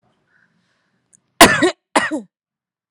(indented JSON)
{
  "cough_length": "2.9 s",
  "cough_amplitude": 32768,
  "cough_signal_mean_std_ratio": 0.28,
  "survey_phase": "alpha (2021-03-01 to 2021-08-12)",
  "age": "18-44",
  "gender": "Female",
  "wearing_mask": "No",
  "symptom_none": true,
  "smoker_status": "Current smoker (11 or more cigarettes per day)",
  "respiratory_condition_asthma": true,
  "respiratory_condition_other": false,
  "recruitment_source": "REACT",
  "submission_delay": "1 day",
  "covid_test_result": "Negative",
  "covid_test_method": "RT-qPCR"
}